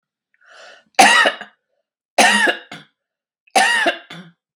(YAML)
three_cough_length: 4.6 s
three_cough_amplitude: 32768
three_cough_signal_mean_std_ratio: 0.42
survey_phase: beta (2021-08-13 to 2022-03-07)
age: 45-64
gender: Female
wearing_mask: 'No'
symptom_none: true
smoker_status: Ex-smoker
respiratory_condition_asthma: false
respiratory_condition_other: false
recruitment_source: REACT
submission_delay: 1 day
covid_test_result: Negative
covid_test_method: RT-qPCR